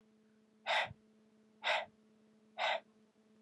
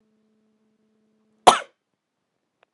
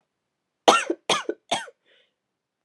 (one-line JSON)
{"exhalation_length": "3.4 s", "exhalation_amplitude": 2701, "exhalation_signal_mean_std_ratio": 0.38, "cough_length": "2.7 s", "cough_amplitude": 32768, "cough_signal_mean_std_ratio": 0.14, "three_cough_length": "2.6 s", "three_cough_amplitude": 31751, "three_cough_signal_mean_std_ratio": 0.29, "survey_phase": "alpha (2021-03-01 to 2021-08-12)", "age": "18-44", "gender": "Female", "wearing_mask": "No", "symptom_cough_any": true, "symptom_headache": true, "smoker_status": "Never smoked", "respiratory_condition_asthma": false, "respiratory_condition_other": false, "recruitment_source": "Test and Trace", "submission_delay": "1 day", "covid_test_result": "Positive", "covid_test_method": "LFT"}